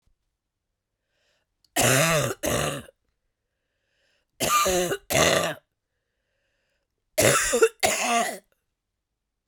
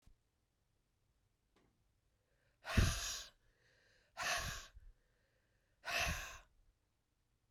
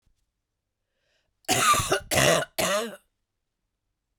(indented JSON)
{
  "three_cough_length": "9.5 s",
  "three_cough_amplitude": 17915,
  "three_cough_signal_mean_std_ratio": 0.45,
  "exhalation_length": "7.5 s",
  "exhalation_amplitude": 3370,
  "exhalation_signal_mean_std_ratio": 0.33,
  "cough_length": "4.2 s",
  "cough_amplitude": 16291,
  "cough_signal_mean_std_ratio": 0.42,
  "survey_phase": "beta (2021-08-13 to 2022-03-07)",
  "age": "45-64",
  "gender": "Female",
  "wearing_mask": "No",
  "symptom_cough_any": true,
  "symptom_runny_or_blocked_nose": true,
  "symptom_sore_throat": true,
  "symptom_fatigue": true,
  "symptom_change_to_sense_of_smell_or_taste": true,
  "symptom_loss_of_taste": true,
  "symptom_onset": "7 days",
  "smoker_status": "Ex-smoker",
  "respiratory_condition_asthma": false,
  "respiratory_condition_other": false,
  "recruitment_source": "Test and Trace",
  "submission_delay": "1 day",
  "covid_test_result": "Positive",
  "covid_test_method": "RT-qPCR",
  "covid_ct_value": 22.9,
  "covid_ct_gene": "ORF1ab gene"
}